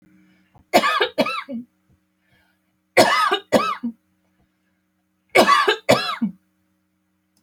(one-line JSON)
{"three_cough_length": "7.4 s", "three_cough_amplitude": 29228, "three_cough_signal_mean_std_ratio": 0.4, "survey_phase": "alpha (2021-03-01 to 2021-08-12)", "age": "45-64", "gender": "Female", "wearing_mask": "No", "symptom_none": true, "smoker_status": "Never smoked", "respiratory_condition_asthma": true, "respiratory_condition_other": false, "recruitment_source": "REACT", "submission_delay": "2 days", "covid_test_result": "Negative", "covid_test_method": "RT-qPCR"}